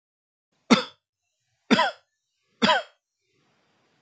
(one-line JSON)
{"three_cough_length": "4.0 s", "three_cough_amplitude": 27395, "three_cough_signal_mean_std_ratio": 0.27, "survey_phase": "beta (2021-08-13 to 2022-03-07)", "age": "18-44", "gender": "Male", "wearing_mask": "No", "symptom_none": true, "smoker_status": "Never smoked", "respiratory_condition_asthma": false, "respiratory_condition_other": false, "recruitment_source": "REACT", "submission_delay": "2 days", "covid_test_result": "Negative", "covid_test_method": "RT-qPCR", "influenza_a_test_result": "Negative", "influenza_b_test_result": "Negative"}